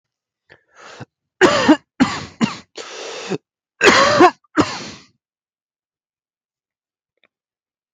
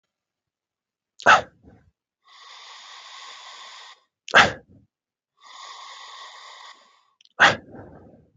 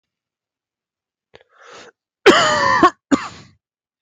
{"three_cough_length": "7.9 s", "three_cough_amplitude": 31482, "three_cough_signal_mean_std_ratio": 0.33, "exhalation_length": "8.4 s", "exhalation_amplitude": 32767, "exhalation_signal_mean_std_ratio": 0.23, "cough_length": "4.0 s", "cough_amplitude": 32768, "cough_signal_mean_std_ratio": 0.34, "survey_phase": "beta (2021-08-13 to 2022-03-07)", "age": "18-44", "gender": "Male", "wearing_mask": "No", "symptom_cough_any": true, "symptom_new_continuous_cough": true, "symptom_runny_or_blocked_nose": true, "symptom_sore_throat": true, "symptom_fatigue": true, "symptom_fever_high_temperature": true, "symptom_headache": true, "symptom_change_to_sense_of_smell_or_taste": true, "symptom_loss_of_taste": true, "symptom_onset": "3 days", "smoker_status": "Ex-smoker", "respiratory_condition_asthma": false, "respiratory_condition_other": false, "recruitment_source": "Test and Trace", "submission_delay": "2 days", "covid_test_result": "Positive", "covid_test_method": "RT-qPCR", "covid_ct_value": 15.6, "covid_ct_gene": "ORF1ab gene"}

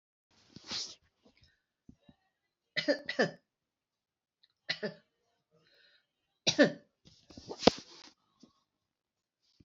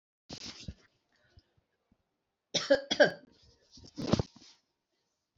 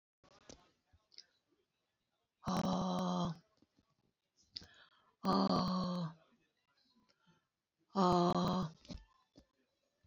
{"three_cough_length": "9.6 s", "three_cough_amplitude": 18989, "three_cough_signal_mean_std_ratio": 0.21, "cough_length": "5.4 s", "cough_amplitude": 10218, "cough_signal_mean_std_ratio": 0.25, "exhalation_length": "10.1 s", "exhalation_amplitude": 3750, "exhalation_signal_mean_std_ratio": 0.4, "survey_phase": "alpha (2021-03-01 to 2021-08-12)", "age": "65+", "gender": "Female", "wearing_mask": "No", "symptom_none": true, "smoker_status": "Never smoked", "respiratory_condition_asthma": false, "respiratory_condition_other": false, "recruitment_source": "REACT", "submission_delay": "3 days", "covid_test_result": "Negative", "covid_test_method": "RT-qPCR"}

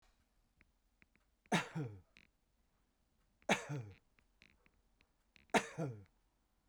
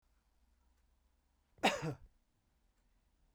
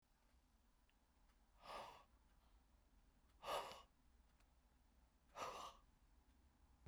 {"three_cough_length": "6.7 s", "three_cough_amplitude": 4229, "three_cough_signal_mean_std_ratio": 0.27, "cough_length": "3.3 s", "cough_amplitude": 3761, "cough_signal_mean_std_ratio": 0.23, "exhalation_length": "6.9 s", "exhalation_amplitude": 573, "exhalation_signal_mean_std_ratio": 0.42, "survey_phase": "beta (2021-08-13 to 2022-03-07)", "age": "45-64", "gender": "Male", "wearing_mask": "No", "symptom_runny_or_blocked_nose": true, "symptom_fatigue": true, "smoker_status": "Never smoked", "respiratory_condition_asthma": false, "respiratory_condition_other": false, "recruitment_source": "REACT", "submission_delay": "1 day", "covid_test_result": "Negative", "covid_test_method": "RT-qPCR", "influenza_a_test_result": "Negative", "influenza_b_test_result": "Negative"}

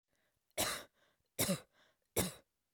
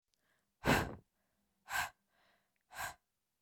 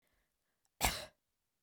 {"three_cough_length": "2.7 s", "three_cough_amplitude": 3264, "three_cough_signal_mean_std_ratio": 0.36, "exhalation_length": "3.4 s", "exhalation_amplitude": 3991, "exhalation_signal_mean_std_ratio": 0.3, "cough_length": "1.6 s", "cough_amplitude": 4961, "cough_signal_mean_std_ratio": 0.26, "survey_phase": "beta (2021-08-13 to 2022-03-07)", "age": "18-44", "gender": "Female", "wearing_mask": "No", "symptom_none": true, "smoker_status": "Never smoked", "respiratory_condition_asthma": false, "respiratory_condition_other": false, "recruitment_source": "REACT", "submission_delay": "1 day", "covid_test_result": "Negative", "covid_test_method": "RT-qPCR"}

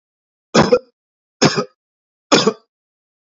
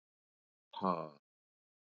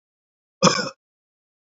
{"three_cough_length": "3.3 s", "three_cough_amplitude": 31310, "three_cough_signal_mean_std_ratio": 0.32, "exhalation_length": "2.0 s", "exhalation_amplitude": 3840, "exhalation_signal_mean_std_ratio": 0.26, "cough_length": "1.7 s", "cough_amplitude": 27788, "cough_signal_mean_std_ratio": 0.26, "survey_phase": "beta (2021-08-13 to 2022-03-07)", "age": "45-64", "gender": "Male", "wearing_mask": "No", "symptom_fatigue": true, "symptom_headache": true, "smoker_status": "Never smoked", "respiratory_condition_asthma": false, "respiratory_condition_other": false, "recruitment_source": "REACT", "submission_delay": "0 days", "covid_test_result": "Negative", "covid_test_method": "RT-qPCR", "influenza_a_test_result": "Negative", "influenza_b_test_result": "Negative"}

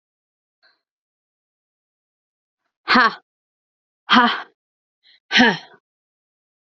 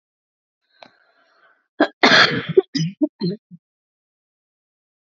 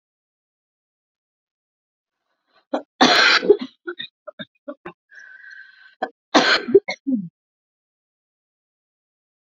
{"exhalation_length": "6.7 s", "exhalation_amplitude": 28406, "exhalation_signal_mean_std_ratio": 0.25, "cough_length": "5.1 s", "cough_amplitude": 31263, "cough_signal_mean_std_ratio": 0.3, "three_cough_length": "9.5 s", "three_cough_amplitude": 28735, "three_cough_signal_mean_std_ratio": 0.28, "survey_phase": "beta (2021-08-13 to 2022-03-07)", "age": "18-44", "gender": "Female", "wearing_mask": "No", "symptom_cough_any": true, "symptom_new_continuous_cough": true, "symptom_runny_or_blocked_nose": true, "symptom_sore_throat": true, "symptom_fatigue": true, "symptom_headache": true, "symptom_other": true, "symptom_onset": "5 days", "smoker_status": "Never smoked", "respiratory_condition_asthma": false, "respiratory_condition_other": false, "recruitment_source": "Test and Trace", "submission_delay": "3 days", "covid_test_result": "Positive", "covid_test_method": "RT-qPCR", "covid_ct_value": 37.5, "covid_ct_gene": "N gene"}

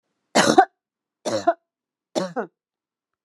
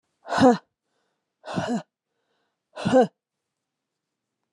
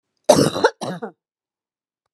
{"three_cough_length": "3.2 s", "three_cough_amplitude": 31988, "three_cough_signal_mean_std_ratio": 0.31, "exhalation_length": "4.5 s", "exhalation_amplitude": 19318, "exhalation_signal_mean_std_ratio": 0.31, "cough_length": "2.1 s", "cough_amplitude": 32767, "cough_signal_mean_std_ratio": 0.33, "survey_phase": "alpha (2021-03-01 to 2021-08-12)", "age": "45-64", "gender": "Female", "wearing_mask": "No", "symptom_none": true, "smoker_status": "Never smoked", "respiratory_condition_asthma": false, "respiratory_condition_other": false, "recruitment_source": "REACT", "submission_delay": "1 day", "covid_test_result": "Negative", "covid_test_method": "RT-qPCR"}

